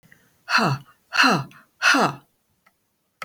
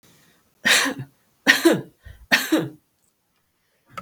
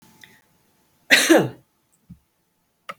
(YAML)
exhalation_length: 3.2 s
exhalation_amplitude: 22113
exhalation_signal_mean_std_ratio: 0.43
three_cough_length: 4.0 s
three_cough_amplitude: 32768
three_cough_signal_mean_std_ratio: 0.37
cough_length: 3.0 s
cough_amplitude: 32768
cough_signal_mean_std_ratio: 0.27
survey_phase: beta (2021-08-13 to 2022-03-07)
age: 45-64
gender: Female
wearing_mask: 'No'
symptom_none: true
smoker_status: Never smoked
respiratory_condition_asthma: false
respiratory_condition_other: false
recruitment_source: Test and Trace
submission_delay: 1 day
covid_test_result: Negative
covid_test_method: LFT